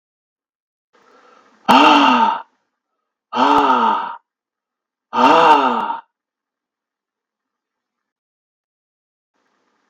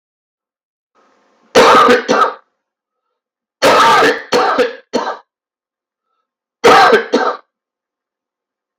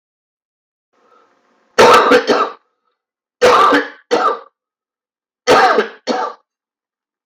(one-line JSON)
{"exhalation_length": "9.9 s", "exhalation_amplitude": 32768, "exhalation_signal_mean_std_ratio": 0.38, "cough_length": "8.8 s", "cough_amplitude": 32768, "cough_signal_mean_std_ratio": 0.46, "three_cough_length": "7.3 s", "three_cough_amplitude": 32768, "three_cough_signal_mean_std_ratio": 0.44, "survey_phase": "beta (2021-08-13 to 2022-03-07)", "age": "45-64", "gender": "Male", "wearing_mask": "No", "symptom_cough_any": true, "symptom_runny_or_blocked_nose": true, "symptom_fatigue": true, "symptom_onset": "11 days", "smoker_status": "Never smoked", "respiratory_condition_asthma": false, "respiratory_condition_other": false, "recruitment_source": "REACT", "submission_delay": "1 day", "covid_test_result": "Negative", "covid_test_method": "RT-qPCR"}